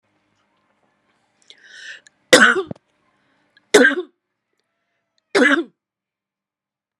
{"three_cough_length": "7.0 s", "three_cough_amplitude": 32768, "three_cough_signal_mean_std_ratio": 0.26, "survey_phase": "beta (2021-08-13 to 2022-03-07)", "age": "45-64", "gender": "Female", "wearing_mask": "No", "symptom_none": true, "smoker_status": "Never smoked", "respiratory_condition_asthma": false, "respiratory_condition_other": false, "recruitment_source": "REACT", "submission_delay": "0 days", "covid_test_result": "Negative", "covid_test_method": "RT-qPCR", "influenza_a_test_result": "Negative", "influenza_b_test_result": "Negative"}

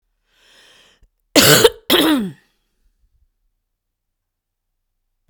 {"cough_length": "5.3 s", "cough_amplitude": 32768, "cough_signal_mean_std_ratio": 0.29, "survey_phase": "beta (2021-08-13 to 2022-03-07)", "age": "45-64", "gender": "Female", "wearing_mask": "No", "symptom_other": true, "symptom_onset": "8 days", "smoker_status": "Ex-smoker", "respiratory_condition_asthma": false, "respiratory_condition_other": false, "recruitment_source": "REACT", "submission_delay": "1 day", "covid_test_result": "Negative", "covid_test_method": "RT-qPCR", "influenza_a_test_result": "Negative", "influenza_b_test_result": "Negative"}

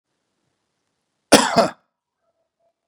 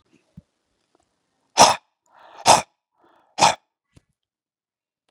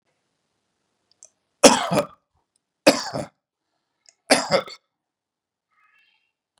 {"cough_length": "2.9 s", "cough_amplitude": 32768, "cough_signal_mean_std_ratio": 0.23, "exhalation_length": "5.1 s", "exhalation_amplitude": 32670, "exhalation_signal_mean_std_ratio": 0.22, "three_cough_length": "6.6 s", "three_cough_amplitude": 32768, "three_cough_signal_mean_std_ratio": 0.23, "survey_phase": "beta (2021-08-13 to 2022-03-07)", "age": "45-64", "gender": "Male", "wearing_mask": "No", "symptom_none": true, "smoker_status": "Ex-smoker", "respiratory_condition_asthma": false, "respiratory_condition_other": false, "recruitment_source": "REACT", "submission_delay": "2 days", "covid_test_result": "Negative", "covid_test_method": "RT-qPCR", "influenza_a_test_result": "Negative", "influenza_b_test_result": "Negative"}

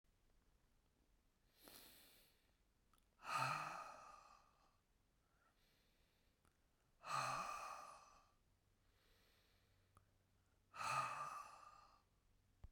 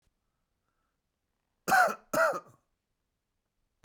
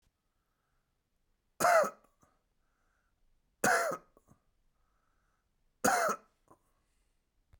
{"exhalation_length": "12.7 s", "exhalation_amplitude": 1130, "exhalation_signal_mean_std_ratio": 0.39, "cough_length": "3.8 s", "cough_amplitude": 8038, "cough_signal_mean_std_ratio": 0.29, "three_cough_length": "7.6 s", "three_cough_amplitude": 7214, "three_cough_signal_mean_std_ratio": 0.28, "survey_phase": "beta (2021-08-13 to 2022-03-07)", "age": "45-64", "gender": "Male", "wearing_mask": "No", "symptom_cough_any": true, "symptom_new_continuous_cough": true, "symptom_runny_or_blocked_nose": true, "symptom_onset": "12 days", "smoker_status": "Never smoked", "respiratory_condition_asthma": false, "respiratory_condition_other": false, "recruitment_source": "REACT", "submission_delay": "1 day", "covid_test_result": "Negative", "covid_test_method": "RT-qPCR"}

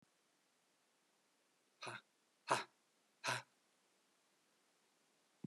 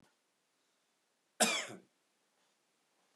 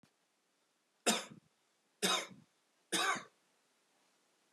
{"exhalation_length": "5.5 s", "exhalation_amplitude": 3002, "exhalation_signal_mean_std_ratio": 0.23, "cough_length": "3.2 s", "cough_amplitude": 4991, "cough_signal_mean_std_ratio": 0.23, "three_cough_length": "4.5 s", "three_cough_amplitude": 4939, "three_cough_signal_mean_std_ratio": 0.32, "survey_phase": "beta (2021-08-13 to 2022-03-07)", "age": "45-64", "gender": "Male", "wearing_mask": "No", "symptom_cough_any": true, "symptom_runny_or_blocked_nose": true, "symptom_diarrhoea": true, "symptom_fatigue": true, "symptom_fever_high_temperature": true, "symptom_change_to_sense_of_smell_or_taste": true, "symptom_onset": "2 days", "smoker_status": "Ex-smoker", "respiratory_condition_asthma": false, "respiratory_condition_other": false, "recruitment_source": "Test and Trace", "submission_delay": "1 day", "covid_test_result": "Positive", "covid_test_method": "RT-qPCR"}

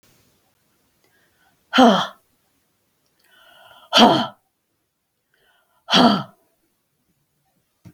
{"exhalation_length": "7.9 s", "exhalation_amplitude": 32768, "exhalation_signal_mean_std_ratio": 0.27, "survey_phase": "beta (2021-08-13 to 2022-03-07)", "age": "45-64", "gender": "Female", "wearing_mask": "No", "symptom_none": true, "smoker_status": "Never smoked", "respiratory_condition_asthma": false, "respiratory_condition_other": false, "recruitment_source": "REACT", "submission_delay": "2 days", "covid_test_result": "Negative", "covid_test_method": "RT-qPCR"}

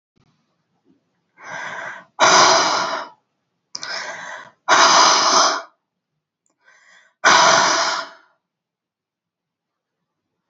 {"exhalation_length": "10.5 s", "exhalation_amplitude": 31825, "exhalation_signal_mean_std_ratio": 0.43, "survey_phase": "beta (2021-08-13 to 2022-03-07)", "age": "45-64", "gender": "Female", "wearing_mask": "No", "symptom_none": true, "smoker_status": "Ex-smoker", "respiratory_condition_asthma": false, "respiratory_condition_other": false, "recruitment_source": "REACT", "submission_delay": "1 day", "covid_test_result": "Negative", "covid_test_method": "RT-qPCR"}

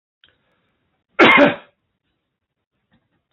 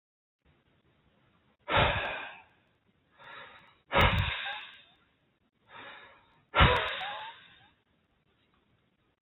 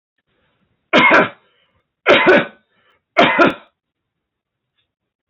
{"cough_length": "3.3 s", "cough_amplitude": 30656, "cough_signal_mean_std_ratio": 0.26, "exhalation_length": "9.2 s", "exhalation_amplitude": 15382, "exhalation_signal_mean_std_ratio": 0.33, "three_cough_length": "5.3 s", "three_cough_amplitude": 29614, "three_cough_signal_mean_std_ratio": 0.37, "survey_phase": "alpha (2021-03-01 to 2021-08-12)", "age": "18-44", "gender": "Male", "wearing_mask": "No", "symptom_fatigue": true, "smoker_status": "Never smoked", "respiratory_condition_asthma": false, "respiratory_condition_other": false, "recruitment_source": "REACT", "submission_delay": "1 day", "covid_test_result": "Negative", "covid_test_method": "RT-qPCR"}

